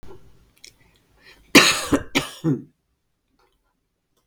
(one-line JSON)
{"cough_length": "4.3 s", "cough_amplitude": 32768, "cough_signal_mean_std_ratio": 0.29, "survey_phase": "beta (2021-08-13 to 2022-03-07)", "age": "65+", "gender": "Female", "wearing_mask": "No", "symptom_none": true, "smoker_status": "Never smoked", "respiratory_condition_asthma": false, "respiratory_condition_other": false, "recruitment_source": "REACT", "submission_delay": "1 day", "covid_test_result": "Negative", "covid_test_method": "RT-qPCR"}